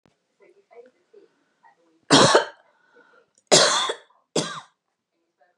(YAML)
three_cough_length: 5.6 s
three_cough_amplitude: 31039
three_cough_signal_mean_std_ratio: 0.3
survey_phase: beta (2021-08-13 to 2022-03-07)
age: 45-64
gender: Female
wearing_mask: 'No'
symptom_fatigue: true
symptom_headache: true
symptom_onset: 13 days
smoker_status: Never smoked
respiratory_condition_asthma: true
respiratory_condition_other: false
recruitment_source: REACT
submission_delay: 2 days
covid_test_result: Negative
covid_test_method: RT-qPCR
influenza_a_test_result: Negative
influenza_b_test_result: Negative